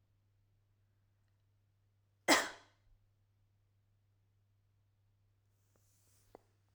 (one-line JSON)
{"cough_length": "6.7 s", "cough_amplitude": 7343, "cough_signal_mean_std_ratio": 0.15, "survey_phase": "alpha (2021-03-01 to 2021-08-12)", "age": "18-44", "gender": "Female", "wearing_mask": "No", "symptom_none": true, "smoker_status": "Never smoked", "respiratory_condition_asthma": false, "respiratory_condition_other": false, "recruitment_source": "REACT", "submission_delay": "2 days", "covid_test_result": "Negative", "covid_test_method": "RT-qPCR"}